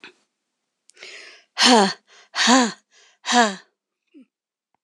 {"exhalation_length": "4.8 s", "exhalation_amplitude": 25334, "exhalation_signal_mean_std_ratio": 0.35, "survey_phase": "beta (2021-08-13 to 2022-03-07)", "age": "45-64", "gender": "Female", "wearing_mask": "No", "symptom_cough_any": true, "symptom_new_continuous_cough": true, "symptom_runny_or_blocked_nose": true, "symptom_shortness_of_breath": true, "symptom_fatigue": true, "symptom_headache": true, "symptom_change_to_sense_of_smell_or_taste": true, "symptom_onset": "3 days", "smoker_status": "Never smoked", "respiratory_condition_asthma": true, "respiratory_condition_other": false, "recruitment_source": "Test and Trace", "submission_delay": "2 days", "covid_test_result": "Positive", "covid_test_method": "RT-qPCR", "covid_ct_value": 23.2, "covid_ct_gene": "ORF1ab gene"}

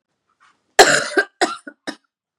{"cough_length": "2.4 s", "cough_amplitude": 32768, "cough_signal_mean_std_ratio": 0.32, "survey_phase": "beta (2021-08-13 to 2022-03-07)", "age": "18-44", "gender": "Female", "wearing_mask": "No", "symptom_cough_any": true, "symptom_new_continuous_cough": true, "symptom_shortness_of_breath": true, "symptom_sore_throat": true, "symptom_fatigue": true, "symptom_fever_high_temperature": true, "symptom_headache": true, "symptom_onset": "3 days", "smoker_status": "Never smoked", "respiratory_condition_asthma": false, "respiratory_condition_other": false, "recruitment_source": "Test and Trace", "submission_delay": "2 days", "covid_test_result": "Positive", "covid_test_method": "RT-qPCR", "covid_ct_value": 22.7, "covid_ct_gene": "ORF1ab gene"}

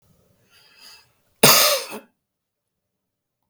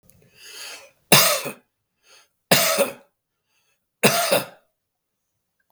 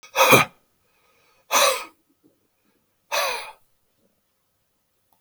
{"cough_length": "3.5 s", "cough_amplitude": 32768, "cough_signal_mean_std_ratio": 0.27, "three_cough_length": "5.7 s", "three_cough_amplitude": 32768, "three_cough_signal_mean_std_ratio": 0.34, "exhalation_length": "5.2 s", "exhalation_amplitude": 32768, "exhalation_signal_mean_std_ratio": 0.3, "survey_phase": "beta (2021-08-13 to 2022-03-07)", "age": "65+", "gender": "Male", "wearing_mask": "No", "symptom_runny_or_blocked_nose": true, "symptom_sore_throat": true, "smoker_status": "Ex-smoker", "respiratory_condition_asthma": false, "respiratory_condition_other": false, "recruitment_source": "REACT", "submission_delay": "2 days", "covid_test_result": "Negative", "covid_test_method": "RT-qPCR"}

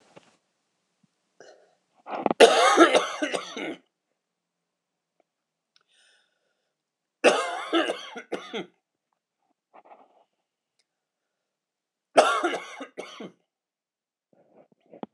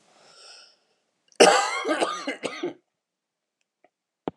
{"three_cough_length": "15.1 s", "three_cough_amplitude": 26028, "three_cough_signal_mean_std_ratio": 0.27, "cough_length": "4.4 s", "cough_amplitude": 24630, "cough_signal_mean_std_ratio": 0.32, "survey_phase": "beta (2021-08-13 to 2022-03-07)", "age": "45-64", "gender": "Female", "wearing_mask": "No", "symptom_cough_any": true, "symptom_new_continuous_cough": true, "symptom_runny_or_blocked_nose": true, "symptom_shortness_of_breath": true, "symptom_diarrhoea": true, "symptom_fatigue": true, "symptom_headache": true, "symptom_onset": "5 days", "smoker_status": "Never smoked", "respiratory_condition_asthma": false, "respiratory_condition_other": false, "recruitment_source": "Test and Trace", "submission_delay": "2 days", "covid_test_result": "Positive", "covid_test_method": "RT-qPCR"}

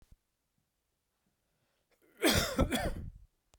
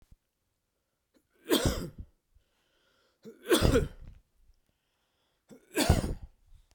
{"cough_length": "3.6 s", "cough_amplitude": 6689, "cough_signal_mean_std_ratio": 0.36, "three_cough_length": "6.7 s", "three_cough_amplitude": 14855, "three_cough_signal_mean_std_ratio": 0.32, "survey_phase": "beta (2021-08-13 to 2022-03-07)", "age": "45-64", "gender": "Male", "wearing_mask": "No", "symptom_cough_any": true, "symptom_runny_or_blocked_nose": true, "symptom_fatigue": true, "symptom_headache": true, "symptom_onset": "2 days", "smoker_status": "Never smoked", "respiratory_condition_asthma": false, "respiratory_condition_other": false, "recruitment_source": "Test and Trace", "submission_delay": "1 day", "covid_test_result": "Positive", "covid_test_method": "RT-qPCR"}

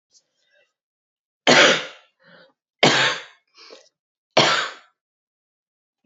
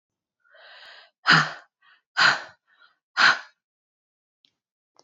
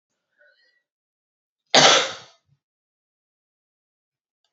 {"three_cough_length": "6.1 s", "three_cough_amplitude": 31264, "three_cough_signal_mean_std_ratio": 0.32, "exhalation_length": "5.0 s", "exhalation_amplitude": 20623, "exhalation_signal_mean_std_ratio": 0.28, "cough_length": "4.5 s", "cough_amplitude": 32768, "cough_signal_mean_std_ratio": 0.21, "survey_phase": "beta (2021-08-13 to 2022-03-07)", "age": "45-64", "gender": "Female", "wearing_mask": "No", "symptom_cough_any": true, "symptom_runny_or_blocked_nose": true, "symptom_fatigue": true, "symptom_loss_of_taste": true, "symptom_onset": "3 days", "smoker_status": "Never smoked", "respiratory_condition_asthma": false, "respiratory_condition_other": false, "recruitment_source": "Test and Trace", "submission_delay": "2 days", "covid_test_result": "Positive", "covid_test_method": "ePCR"}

